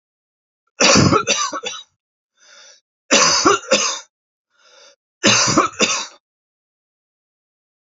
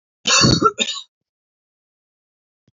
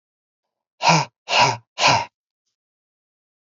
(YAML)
three_cough_length: 7.9 s
three_cough_amplitude: 32768
three_cough_signal_mean_std_ratio: 0.43
cough_length: 2.7 s
cough_amplitude: 26709
cough_signal_mean_std_ratio: 0.36
exhalation_length: 3.5 s
exhalation_amplitude: 26662
exhalation_signal_mean_std_ratio: 0.36
survey_phase: alpha (2021-03-01 to 2021-08-12)
age: 45-64
gender: Male
wearing_mask: 'No'
symptom_none: true
smoker_status: Never smoked
respiratory_condition_asthma: false
respiratory_condition_other: false
recruitment_source: REACT
submission_delay: 1 day
covid_test_result: Negative
covid_test_method: RT-qPCR